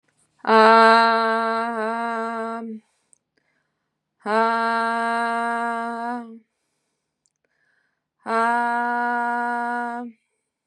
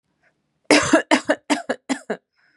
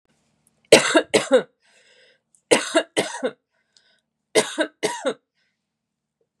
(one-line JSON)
{"exhalation_length": "10.7 s", "exhalation_amplitude": 29379, "exhalation_signal_mean_std_ratio": 0.54, "cough_length": "2.6 s", "cough_amplitude": 32616, "cough_signal_mean_std_ratio": 0.39, "three_cough_length": "6.4 s", "three_cough_amplitude": 32767, "three_cough_signal_mean_std_ratio": 0.32, "survey_phase": "beta (2021-08-13 to 2022-03-07)", "age": "18-44", "gender": "Female", "wearing_mask": "No", "symptom_none": true, "smoker_status": "Never smoked", "respiratory_condition_asthma": true, "respiratory_condition_other": false, "recruitment_source": "REACT", "submission_delay": "3 days", "covid_test_result": "Negative", "covid_test_method": "RT-qPCR", "influenza_a_test_result": "Negative", "influenza_b_test_result": "Negative"}